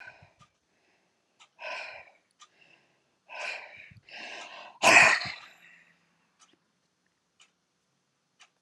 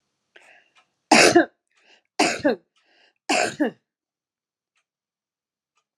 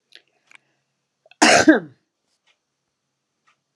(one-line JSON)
{"exhalation_length": "8.6 s", "exhalation_amplitude": 21496, "exhalation_signal_mean_std_ratio": 0.23, "three_cough_length": "6.0 s", "three_cough_amplitude": 26818, "three_cough_signal_mean_std_ratio": 0.29, "cough_length": "3.8 s", "cough_amplitude": 32123, "cough_signal_mean_std_ratio": 0.24, "survey_phase": "beta (2021-08-13 to 2022-03-07)", "age": "65+", "gender": "Female", "wearing_mask": "No", "symptom_none": true, "smoker_status": "Ex-smoker", "respiratory_condition_asthma": false, "respiratory_condition_other": false, "recruitment_source": "REACT", "submission_delay": "4 days", "covid_test_result": "Negative", "covid_test_method": "RT-qPCR"}